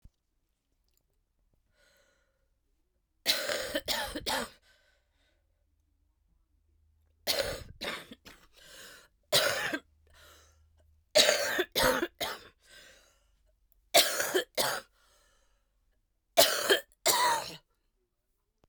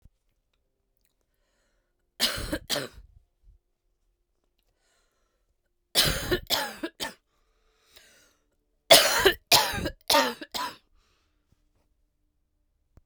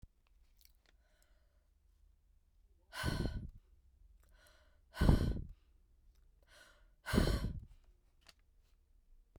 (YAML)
cough_length: 18.7 s
cough_amplitude: 16147
cough_signal_mean_std_ratio: 0.36
three_cough_length: 13.1 s
three_cough_amplitude: 27124
three_cough_signal_mean_std_ratio: 0.29
exhalation_length: 9.4 s
exhalation_amplitude: 7372
exhalation_signal_mean_std_ratio: 0.31
survey_phase: beta (2021-08-13 to 2022-03-07)
age: 18-44
gender: Female
wearing_mask: 'No'
symptom_cough_any: true
symptom_new_continuous_cough: true
symptom_runny_or_blocked_nose: true
symptom_shortness_of_breath: true
symptom_fever_high_temperature: true
symptom_headache: true
symptom_change_to_sense_of_smell_or_taste: true
symptom_loss_of_taste: true
smoker_status: Current smoker (1 to 10 cigarettes per day)
respiratory_condition_asthma: false
respiratory_condition_other: false
recruitment_source: Test and Trace
submission_delay: 2 days
covid_test_result: Positive
covid_test_method: RT-qPCR
covid_ct_value: 21.5
covid_ct_gene: ORF1ab gene